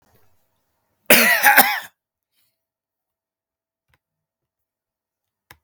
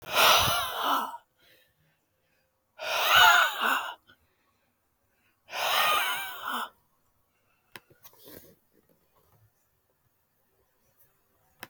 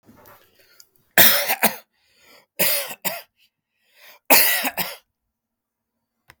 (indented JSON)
{
  "cough_length": "5.6 s",
  "cough_amplitude": 32768,
  "cough_signal_mean_std_ratio": 0.26,
  "exhalation_length": "11.7 s",
  "exhalation_amplitude": 15231,
  "exhalation_signal_mean_std_ratio": 0.38,
  "three_cough_length": "6.4 s",
  "three_cough_amplitude": 32768,
  "three_cough_signal_mean_std_ratio": 0.34,
  "survey_phase": "beta (2021-08-13 to 2022-03-07)",
  "age": "18-44",
  "gender": "Male",
  "wearing_mask": "No",
  "symptom_none": true,
  "smoker_status": "Ex-smoker",
  "respiratory_condition_asthma": false,
  "respiratory_condition_other": false,
  "recruitment_source": "REACT",
  "submission_delay": "1 day",
  "covid_test_result": "Negative",
  "covid_test_method": "RT-qPCR",
  "influenza_a_test_result": "Negative",
  "influenza_b_test_result": "Negative"
}